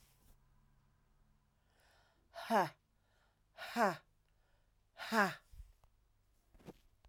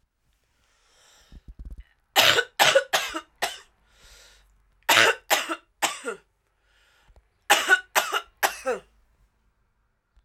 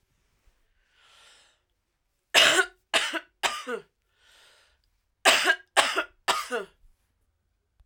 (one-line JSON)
{"exhalation_length": "7.1 s", "exhalation_amplitude": 4107, "exhalation_signal_mean_std_ratio": 0.28, "three_cough_length": "10.2 s", "three_cough_amplitude": 32767, "three_cough_signal_mean_std_ratio": 0.34, "cough_length": "7.9 s", "cough_amplitude": 24255, "cough_signal_mean_std_ratio": 0.33, "survey_phase": "alpha (2021-03-01 to 2021-08-12)", "age": "18-44", "gender": "Male", "wearing_mask": "No", "symptom_cough_any": true, "symptom_fatigue": true, "symptom_headache": true, "symptom_change_to_sense_of_smell_or_taste": true, "smoker_status": "Ex-smoker", "respiratory_condition_asthma": false, "respiratory_condition_other": false, "recruitment_source": "Test and Trace", "submission_delay": "2 days", "covid_test_result": "Positive", "covid_test_method": "RT-qPCR", "covid_ct_value": 13.5, "covid_ct_gene": "S gene", "covid_ct_mean": 14.0, "covid_viral_load": "26000000 copies/ml", "covid_viral_load_category": "High viral load (>1M copies/ml)"}